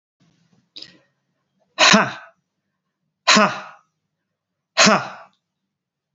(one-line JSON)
{"exhalation_length": "6.1 s", "exhalation_amplitude": 32293, "exhalation_signal_mean_std_ratio": 0.29, "survey_phase": "beta (2021-08-13 to 2022-03-07)", "age": "45-64", "gender": "Male", "wearing_mask": "No", "symptom_cough_any": true, "symptom_runny_or_blocked_nose": true, "symptom_onset": "3 days", "smoker_status": "Never smoked", "respiratory_condition_asthma": false, "respiratory_condition_other": false, "recruitment_source": "Test and Trace", "submission_delay": "2 days", "covid_test_result": "Positive", "covid_test_method": "RT-qPCR", "covid_ct_value": 16.2, "covid_ct_gene": "ORF1ab gene", "covid_ct_mean": 16.4, "covid_viral_load": "4100000 copies/ml", "covid_viral_load_category": "High viral load (>1M copies/ml)"}